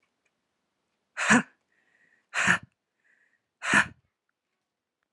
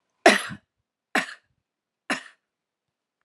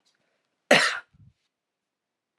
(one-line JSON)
{"exhalation_length": "5.1 s", "exhalation_amplitude": 19869, "exhalation_signal_mean_std_ratio": 0.27, "three_cough_length": "3.2 s", "three_cough_amplitude": 29172, "three_cough_signal_mean_std_ratio": 0.22, "cough_length": "2.4 s", "cough_amplitude": 25551, "cough_signal_mean_std_ratio": 0.24, "survey_phase": "beta (2021-08-13 to 2022-03-07)", "age": "18-44", "gender": "Female", "wearing_mask": "No", "symptom_cough_any": true, "symptom_runny_or_blocked_nose": true, "symptom_fatigue": true, "symptom_headache": true, "symptom_change_to_sense_of_smell_or_taste": true, "symptom_loss_of_taste": true, "symptom_onset": "2 days", "smoker_status": "Never smoked", "respiratory_condition_asthma": true, "respiratory_condition_other": false, "recruitment_source": "Test and Trace", "submission_delay": "2 days", "covid_test_result": "Positive", "covid_test_method": "RT-qPCR", "covid_ct_value": 27.0, "covid_ct_gene": "ORF1ab gene", "covid_ct_mean": 27.7, "covid_viral_load": "820 copies/ml", "covid_viral_load_category": "Minimal viral load (< 10K copies/ml)"}